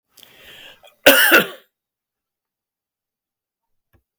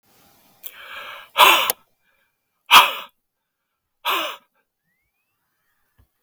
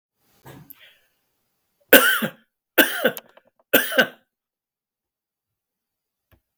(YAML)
cough_length: 4.2 s
cough_amplitude: 32768
cough_signal_mean_std_ratio: 0.25
exhalation_length: 6.2 s
exhalation_amplitude: 32768
exhalation_signal_mean_std_ratio: 0.26
three_cough_length: 6.6 s
three_cough_amplitude: 32768
three_cough_signal_mean_std_ratio: 0.26
survey_phase: beta (2021-08-13 to 2022-03-07)
age: 65+
gender: Male
wearing_mask: 'No'
symptom_none: true
smoker_status: Ex-smoker
respiratory_condition_asthma: false
respiratory_condition_other: false
recruitment_source: REACT
submission_delay: 2 days
covid_test_result: Negative
covid_test_method: RT-qPCR